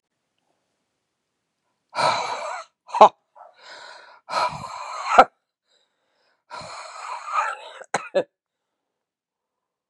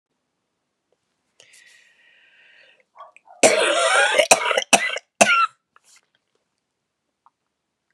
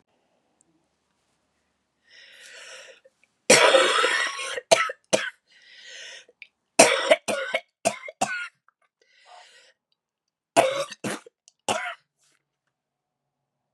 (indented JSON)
{
  "exhalation_length": "9.9 s",
  "exhalation_amplitude": 32768,
  "exhalation_signal_mean_std_ratio": 0.27,
  "cough_length": "7.9 s",
  "cough_amplitude": 32768,
  "cough_signal_mean_std_ratio": 0.34,
  "three_cough_length": "13.7 s",
  "three_cough_amplitude": 32767,
  "three_cough_signal_mean_std_ratio": 0.32,
  "survey_phase": "beta (2021-08-13 to 2022-03-07)",
  "age": "45-64",
  "gender": "Female",
  "wearing_mask": "No",
  "symptom_cough_any": true,
  "symptom_runny_or_blocked_nose": true,
  "symptom_diarrhoea": true,
  "symptom_fatigue": true,
  "symptom_fever_high_temperature": true,
  "symptom_headache": true,
  "symptom_onset": "3 days",
  "smoker_status": "Ex-smoker",
  "respiratory_condition_asthma": false,
  "respiratory_condition_other": false,
  "recruitment_source": "Test and Trace",
  "submission_delay": "1 day",
  "covid_test_result": "Positive",
  "covid_test_method": "RT-qPCR",
  "covid_ct_value": 13.7,
  "covid_ct_gene": "N gene"
}